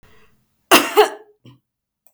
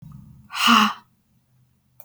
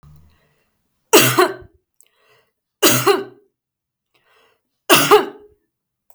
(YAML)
cough_length: 2.1 s
cough_amplitude: 32768
cough_signal_mean_std_ratio: 0.29
exhalation_length: 2.0 s
exhalation_amplitude: 24486
exhalation_signal_mean_std_ratio: 0.36
three_cough_length: 6.1 s
three_cough_amplitude: 32768
three_cough_signal_mean_std_ratio: 0.33
survey_phase: beta (2021-08-13 to 2022-03-07)
age: 45-64
gender: Female
wearing_mask: 'No'
symptom_none: true
smoker_status: Never smoked
respiratory_condition_asthma: false
respiratory_condition_other: false
recruitment_source: REACT
submission_delay: 4 days
covid_test_result: Negative
covid_test_method: RT-qPCR
influenza_a_test_result: Negative
influenza_b_test_result: Negative